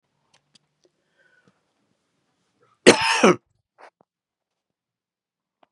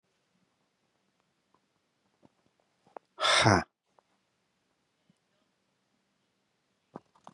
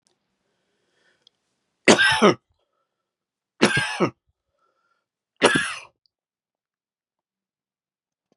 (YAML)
cough_length: 5.7 s
cough_amplitude: 32767
cough_signal_mean_std_ratio: 0.19
exhalation_length: 7.3 s
exhalation_amplitude: 16747
exhalation_signal_mean_std_ratio: 0.19
three_cough_length: 8.4 s
three_cough_amplitude: 32608
three_cough_signal_mean_std_ratio: 0.26
survey_phase: beta (2021-08-13 to 2022-03-07)
age: 45-64
gender: Male
wearing_mask: 'No'
symptom_cough_any: true
symptom_onset: 12 days
smoker_status: Never smoked
respiratory_condition_asthma: false
respiratory_condition_other: false
recruitment_source: REACT
submission_delay: 2 days
covid_test_result: Negative
covid_test_method: RT-qPCR
influenza_a_test_result: Negative
influenza_b_test_result: Negative